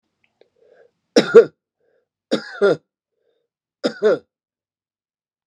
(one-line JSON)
{"three_cough_length": "5.5 s", "three_cough_amplitude": 32768, "three_cough_signal_mean_std_ratio": 0.25, "survey_phase": "beta (2021-08-13 to 2022-03-07)", "age": "45-64", "gender": "Male", "wearing_mask": "No", "symptom_none": true, "smoker_status": "Never smoked", "respiratory_condition_asthma": false, "respiratory_condition_other": false, "recruitment_source": "REACT", "submission_delay": "1 day", "covid_test_result": "Negative", "covid_test_method": "RT-qPCR"}